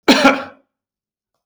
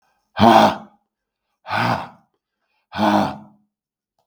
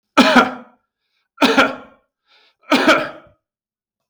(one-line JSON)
{"cough_length": "1.5 s", "cough_amplitude": 32768, "cough_signal_mean_std_ratio": 0.37, "exhalation_length": "4.3 s", "exhalation_amplitude": 32768, "exhalation_signal_mean_std_ratio": 0.37, "three_cough_length": "4.1 s", "three_cough_amplitude": 32768, "three_cough_signal_mean_std_ratio": 0.4, "survey_phase": "beta (2021-08-13 to 2022-03-07)", "age": "65+", "gender": "Male", "wearing_mask": "No", "symptom_runny_or_blocked_nose": true, "symptom_onset": "11 days", "smoker_status": "Ex-smoker", "respiratory_condition_asthma": false, "respiratory_condition_other": false, "recruitment_source": "REACT", "submission_delay": "1 day", "covid_test_result": "Negative", "covid_test_method": "RT-qPCR", "influenza_a_test_result": "Negative", "influenza_b_test_result": "Negative"}